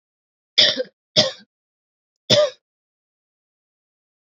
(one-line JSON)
{"three_cough_length": "4.3 s", "three_cough_amplitude": 30831, "three_cough_signal_mean_std_ratio": 0.28, "survey_phase": "beta (2021-08-13 to 2022-03-07)", "age": "18-44", "gender": "Female", "wearing_mask": "No", "symptom_cough_any": true, "symptom_runny_or_blocked_nose": true, "smoker_status": "Never smoked", "respiratory_condition_asthma": false, "respiratory_condition_other": false, "recruitment_source": "Test and Trace", "submission_delay": "2 days", "covid_test_result": "Positive", "covid_test_method": "RT-qPCR", "covid_ct_value": 16.7, "covid_ct_gene": "ORF1ab gene", "covid_ct_mean": 17.0, "covid_viral_load": "2600000 copies/ml", "covid_viral_load_category": "High viral load (>1M copies/ml)"}